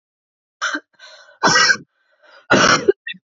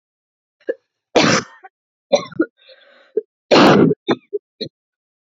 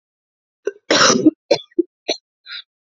{"exhalation_length": "3.3 s", "exhalation_amplitude": 29780, "exhalation_signal_mean_std_ratio": 0.42, "three_cough_length": "5.2 s", "three_cough_amplitude": 30310, "three_cough_signal_mean_std_ratio": 0.36, "cough_length": "3.0 s", "cough_amplitude": 30529, "cough_signal_mean_std_ratio": 0.35, "survey_phase": "alpha (2021-03-01 to 2021-08-12)", "age": "18-44", "gender": "Female", "wearing_mask": "No", "symptom_cough_any": true, "symptom_shortness_of_breath": true, "symptom_fatigue": true, "symptom_fever_high_temperature": true, "symptom_headache": true, "symptom_change_to_sense_of_smell_or_taste": true, "symptom_loss_of_taste": true, "symptom_onset": "3 days", "smoker_status": "Current smoker (1 to 10 cigarettes per day)", "respiratory_condition_asthma": false, "respiratory_condition_other": false, "recruitment_source": "Test and Trace", "submission_delay": "1 day", "covid_test_result": "Positive", "covid_test_method": "RT-qPCR", "covid_ct_value": 12.3, "covid_ct_gene": "ORF1ab gene", "covid_ct_mean": 13.4, "covid_viral_load": "41000000 copies/ml", "covid_viral_load_category": "High viral load (>1M copies/ml)"}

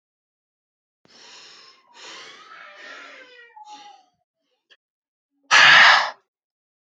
{"exhalation_length": "7.0 s", "exhalation_amplitude": 28695, "exhalation_signal_mean_std_ratio": 0.26, "survey_phase": "alpha (2021-03-01 to 2021-08-12)", "age": "18-44", "gender": "Male", "wearing_mask": "No", "symptom_none": true, "smoker_status": "Never smoked", "respiratory_condition_asthma": false, "respiratory_condition_other": false, "recruitment_source": "REACT", "submission_delay": "1 day", "covid_test_result": "Negative", "covid_test_method": "RT-qPCR"}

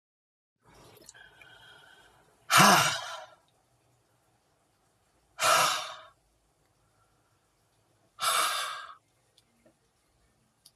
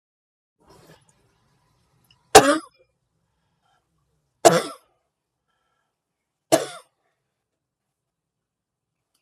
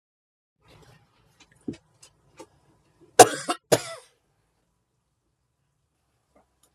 {"exhalation_length": "10.8 s", "exhalation_amplitude": 15522, "exhalation_signal_mean_std_ratio": 0.29, "three_cough_length": "9.2 s", "three_cough_amplitude": 32768, "three_cough_signal_mean_std_ratio": 0.16, "cough_length": "6.7 s", "cough_amplitude": 32768, "cough_signal_mean_std_ratio": 0.13, "survey_phase": "beta (2021-08-13 to 2022-03-07)", "age": "45-64", "gender": "Female", "wearing_mask": "No", "symptom_none": true, "smoker_status": "Never smoked", "respiratory_condition_asthma": true, "respiratory_condition_other": false, "recruitment_source": "REACT", "submission_delay": "1 day", "covid_test_result": "Negative", "covid_test_method": "RT-qPCR"}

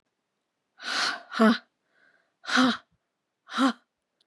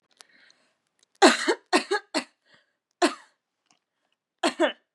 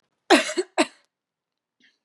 {"exhalation_length": "4.3 s", "exhalation_amplitude": 13461, "exhalation_signal_mean_std_ratio": 0.37, "three_cough_length": "4.9 s", "three_cough_amplitude": 29654, "three_cough_signal_mean_std_ratio": 0.29, "cough_length": "2.0 s", "cough_amplitude": 28180, "cough_signal_mean_std_ratio": 0.28, "survey_phase": "beta (2021-08-13 to 2022-03-07)", "age": "18-44", "gender": "Female", "wearing_mask": "No", "symptom_cough_any": true, "symptom_sore_throat": true, "symptom_fatigue": true, "symptom_onset": "3 days", "smoker_status": "Never smoked", "respiratory_condition_asthma": false, "respiratory_condition_other": false, "recruitment_source": "Test and Trace", "submission_delay": "1 day", "covid_test_result": "Positive", "covid_test_method": "RT-qPCR", "covid_ct_value": 25.9, "covid_ct_gene": "ORF1ab gene", "covid_ct_mean": 26.3, "covid_viral_load": "2300 copies/ml", "covid_viral_load_category": "Minimal viral load (< 10K copies/ml)"}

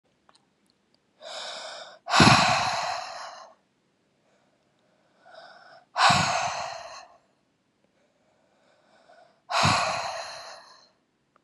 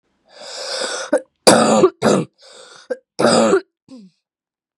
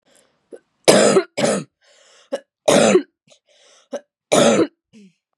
{"exhalation_length": "11.4 s", "exhalation_amplitude": 23211, "exhalation_signal_mean_std_ratio": 0.37, "cough_length": "4.8 s", "cough_amplitude": 32768, "cough_signal_mean_std_ratio": 0.46, "three_cough_length": "5.4 s", "three_cough_amplitude": 32768, "three_cough_signal_mean_std_ratio": 0.41, "survey_phase": "beta (2021-08-13 to 2022-03-07)", "age": "18-44", "gender": "Female", "wearing_mask": "No", "symptom_cough_any": true, "symptom_runny_or_blocked_nose": true, "symptom_sore_throat": true, "symptom_diarrhoea": true, "symptom_fatigue": true, "symptom_headache": true, "symptom_onset": "4 days", "smoker_status": "Current smoker (e-cigarettes or vapes only)", "respiratory_condition_asthma": false, "respiratory_condition_other": false, "recruitment_source": "Test and Trace", "submission_delay": "1 day", "covid_test_result": "Positive", "covid_test_method": "RT-qPCR", "covid_ct_value": 19.1, "covid_ct_gene": "ORF1ab gene", "covid_ct_mean": 19.5, "covid_viral_load": "420000 copies/ml", "covid_viral_load_category": "Low viral load (10K-1M copies/ml)"}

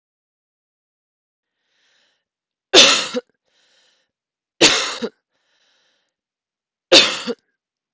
{"three_cough_length": "7.9 s", "three_cough_amplitude": 32768, "three_cough_signal_mean_std_ratio": 0.25, "survey_phase": "beta (2021-08-13 to 2022-03-07)", "age": "45-64", "gender": "Female", "wearing_mask": "No", "symptom_cough_any": true, "symptom_fatigue": true, "symptom_fever_high_temperature": true, "symptom_headache": true, "symptom_other": true, "smoker_status": "Never smoked", "respiratory_condition_asthma": false, "respiratory_condition_other": false, "recruitment_source": "Test and Trace", "submission_delay": "1 day", "covid_test_result": "Positive", "covid_test_method": "RT-qPCR", "covid_ct_value": 24.3, "covid_ct_gene": "ORF1ab gene", "covid_ct_mean": 24.6, "covid_viral_load": "8500 copies/ml", "covid_viral_load_category": "Minimal viral load (< 10K copies/ml)"}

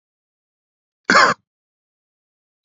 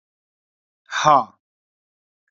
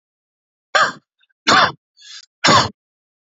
{"cough_length": "2.6 s", "cough_amplitude": 32768, "cough_signal_mean_std_ratio": 0.23, "exhalation_length": "2.3 s", "exhalation_amplitude": 27526, "exhalation_signal_mean_std_ratio": 0.25, "three_cough_length": "3.3 s", "three_cough_amplitude": 32768, "three_cough_signal_mean_std_ratio": 0.36, "survey_phase": "alpha (2021-03-01 to 2021-08-12)", "age": "18-44", "gender": "Male", "wearing_mask": "No", "symptom_none": true, "smoker_status": "Never smoked", "respiratory_condition_asthma": false, "respiratory_condition_other": false, "recruitment_source": "REACT", "submission_delay": "3 days", "covid_test_result": "Negative", "covid_test_method": "RT-qPCR"}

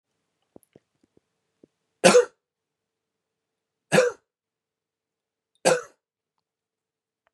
{"three_cough_length": "7.3 s", "three_cough_amplitude": 28871, "three_cough_signal_mean_std_ratio": 0.2, "survey_phase": "beta (2021-08-13 to 2022-03-07)", "age": "45-64", "gender": "Male", "wearing_mask": "No", "symptom_none": true, "smoker_status": "Ex-smoker", "respiratory_condition_asthma": false, "respiratory_condition_other": false, "recruitment_source": "REACT", "submission_delay": "1 day", "covid_test_result": "Negative", "covid_test_method": "RT-qPCR", "influenza_a_test_result": "Negative", "influenza_b_test_result": "Negative"}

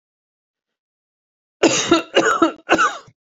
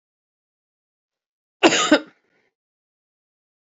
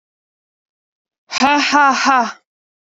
{"three_cough_length": "3.3 s", "three_cough_amplitude": 32767, "three_cough_signal_mean_std_ratio": 0.42, "cough_length": "3.8 s", "cough_amplitude": 29297, "cough_signal_mean_std_ratio": 0.22, "exhalation_length": "2.8 s", "exhalation_amplitude": 28560, "exhalation_signal_mean_std_ratio": 0.47, "survey_phase": "beta (2021-08-13 to 2022-03-07)", "age": "18-44", "gender": "Female", "wearing_mask": "No", "symptom_runny_or_blocked_nose": true, "symptom_sore_throat": true, "symptom_onset": "3 days", "smoker_status": "Current smoker (e-cigarettes or vapes only)", "respiratory_condition_asthma": false, "respiratory_condition_other": false, "recruitment_source": "Test and Trace", "submission_delay": "2 days", "covid_test_result": "Positive", "covid_test_method": "RT-qPCR", "covid_ct_value": 16.8, "covid_ct_gene": "N gene", "covid_ct_mean": 18.1, "covid_viral_load": "1200000 copies/ml", "covid_viral_load_category": "High viral load (>1M copies/ml)"}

